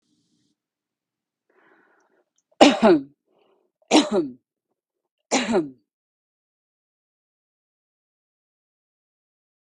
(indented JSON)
{
  "three_cough_length": "9.6 s",
  "three_cough_amplitude": 32768,
  "three_cough_signal_mean_std_ratio": 0.23,
  "survey_phase": "beta (2021-08-13 to 2022-03-07)",
  "age": "45-64",
  "gender": "Female",
  "wearing_mask": "No",
  "symptom_none": true,
  "smoker_status": "Ex-smoker",
  "respiratory_condition_asthma": false,
  "respiratory_condition_other": false,
  "recruitment_source": "REACT",
  "submission_delay": "3 days",
  "covid_test_result": "Negative",
  "covid_test_method": "RT-qPCR",
  "influenza_a_test_result": "Negative",
  "influenza_b_test_result": "Negative"
}